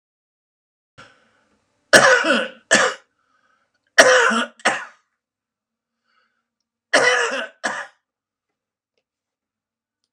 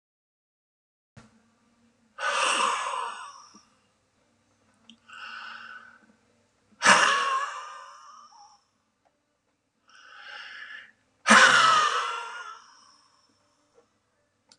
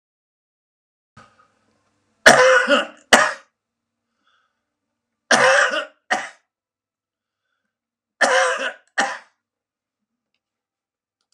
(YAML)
cough_length: 10.1 s
cough_amplitude: 32768
cough_signal_mean_std_ratio: 0.33
exhalation_length: 14.6 s
exhalation_amplitude: 23527
exhalation_signal_mean_std_ratio: 0.34
three_cough_length: 11.3 s
three_cough_amplitude: 32768
three_cough_signal_mean_std_ratio: 0.31
survey_phase: alpha (2021-03-01 to 2021-08-12)
age: 65+
gender: Male
wearing_mask: 'No'
symptom_none: true
smoker_status: Ex-smoker
respiratory_condition_asthma: false
respiratory_condition_other: false
recruitment_source: REACT
submission_delay: 2 days
covid_test_result: Negative
covid_test_method: RT-qPCR